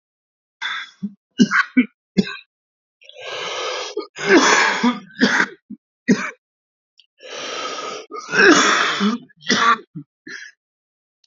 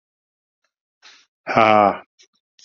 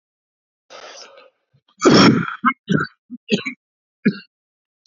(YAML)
three_cough_length: 11.3 s
three_cough_amplitude: 29145
three_cough_signal_mean_std_ratio: 0.47
exhalation_length: 2.6 s
exhalation_amplitude: 28359
exhalation_signal_mean_std_ratio: 0.3
cough_length: 4.9 s
cough_amplitude: 28074
cough_signal_mean_std_ratio: 0.35
survey_phase: beta (2021-08-13 to 2022-03-07)
age: 45-64
gender: Male
wearing_mask: 'No'
symptom_cough_any: true
symptom_runny_or_blocked_nose: true
symptom_fatigue: true
symptom_headache: true
smoker_status: Never smoked
respiratory_condition_asthma: false
respiratory_condition_other: false
recruitment_source: Test and Trace
submission_delay: 2 days
covid_test_result: Positive
covid_test_method: RT-qPCR